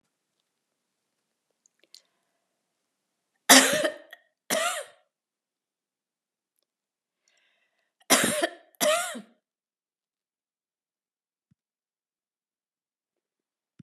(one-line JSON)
{"cough_length": "13.8 s", "cough_amplitude": 31623, "cough_signal_mean_std_ratio": 0.21, "survey_phase": "beta (2021-08-13 to 2022-03-07)", "age": "65+", "gender": "Female", "wearing_mask": "No", "symptom_none": true, "smoker_status": "Ex-smoker", "respiratory_condition_asthma": false, "respiratory_condition_other": false, "recruitment_source": "REACT", "submission_delay": "1 day", "covid_test_result": "Negative", "covid_test_method": "RT-qPCR"}